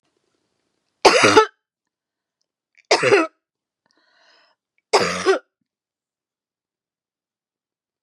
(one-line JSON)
{"three_cough_length": "8.0 s", "three_cough_amplitude": 32767, "three_cough_signal_mean_std_ratio": 0.28, "survey_phase": "beta (2021-08-13 to 2022-03-07)", "age": "45-64", "gender": "Female", "wearing_mask": "No", "symptom_none": true, "smoker_status": "Never smoked", "respiratory_condition_asthma": false, "respiratory_condition_other": false, "recruitment_source": "REACT", "submission_delay": "2 days", "covid_test_result": "Negative", "covid_test_method": "RT-qPCR", "influenza_a_test_result": "Negative", "influenza_b_test_result": "Negative"}